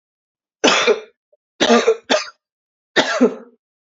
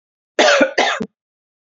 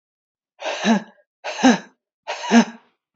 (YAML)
three_cough_length: 3.9 s
three_cough_amplitude: 30786
three_cough_signal_mean_std_ratio: 0.43
cough_length: 1.6 s
cough_amplitude: 29554
cough_signal_mean_std_ratio: 0.48
exhalation_length: 3.2 s
exhalation_amplitude: 27655
exhalation_signal_mean_std_ratio: 0.38
survey_phase: beta (2021-08-13 to 2022-03-07)
age: 45-64
gender: Female
wearing_mask: 'No'
symptom_cough_any: true
symptom_runny_or_blocked_nose: true
symptom_fatigue: true
symptom_headache: true
symptom_change_to_sense_of_smell_or_taste: true
symptom_loss_of_taste: true
symptom_onset: 3 days
smoker_status: Never smoked
respiratory_condition_asthma: false
respiratory_condition_other: false
recruitment_source: Test and Trace
submission_delay: 2 days
covid_test_result: Positive
covid_test_method: RT-qPCR
covid_ct_value: 31.7
covid_ct_gene: N gene